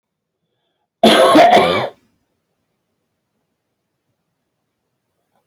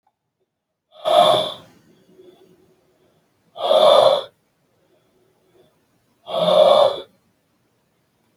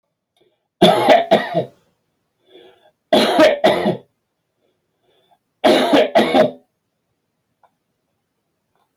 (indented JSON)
{
  "cough_length": "5.5 s",
  "cough_amplitude": 32768,
  "cough_signal_mean_std_ratio": 0.32,
  "exhalation_length": "8.4 s",
  "exhalation_amplitude": 30988,
  "exhalation_signal_mean_std_ratio": 0.37,
  "three_cough_length": "9.0 s",
  "three_cough_amplitude": 32768,
  "three_cough_signal_mean_std_ratio": 0.41,
  "survey_phase": "beta (2021-08-13 to 2022-03-07)",
  "age": "45-64",
  "gender": "Male",
  "wearing_mask": "No",
  "symptom_none": true,
  "smoker_status": "Never smoked",
  "respiratory_condition_asthma": false,
  "respiratory_condition_other": false,
  "recruitment_source": "REACT",
  "submission_delay": "4 days",
  "covid_test_result": "Negative",
  "covid_test_method": "RT-qPCR"
}